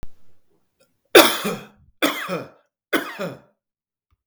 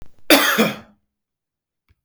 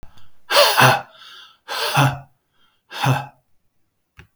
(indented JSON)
{
  "three_cough_length": "4.3 s",
  "three_cough_amplitude": 32768,
  "three_cough_signal_mean_std_ratio": 0.31,
  "cough_length": "2.0 s",
  "cough_amplitude": 32768,
  "cough_signal_mean_std_ratio": 0.37,
  "exhalation_length": "4.4 s",
  "exhalation_amplitude": 32768,
  "exhalation_signal_mean_std_ratio": 0.43,
  "survey_phase": "beta (2021-08-13 to 2022-03-07)",
  "age": "45-64",
  "gender": "Male",
  "wearing_mask": "No",
  "symptom_none": true,
  "smoker_status": "Never smoked",
  "respiratory_condition_asthma": false,
  "respiratory_condition_other": false,
  "recruitment_source": "REACT",
  "submission_delay": "2 days",
  "covid_test_result": "Negative",
  "covid_test_method": "RT-qPCR",
  "influenza_a_test_result": "Negative",
  "influenza_b_test_result": "Negative"
}